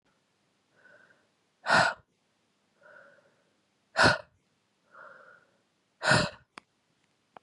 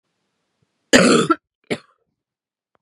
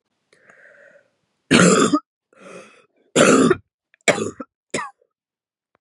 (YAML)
exhalation_length: 7.4 s
exhalation_amplitude: 11059
exhalation_signal_mean_std_ratio: 0.25
cough_length: 2.8 s
cough_amplitude: 32768
cough_signal_mean_std_ratio: 0.31
three_cough_length: 5.8 s
three_cough_amplitude: 32736
three_cough_signal_mean_std_ratio: 0.36
survey_phase: beta (2021-08-13 to 2022-03-07)
age: 18-44
gender: Female
wearing_mask: 'No'
symptom_cough_any: true
symptom_new_continuous_cough: true
symptom_runny_or_blocked_nose: true
symptom_shortness_of_breath: true
symptom_fatigue: true
symptom_onset: 2 days
smoker_status: Ex-smoker
respiratory_condition_asthma: false
respiratory_condition_other: false
recruitment_source: Test and Trace
submission_delay: 1 day
covid_test_result: Positive
covid_test_method: RT-qPCR
covid_ct_value: 16.2
covid_ct_gene: N gene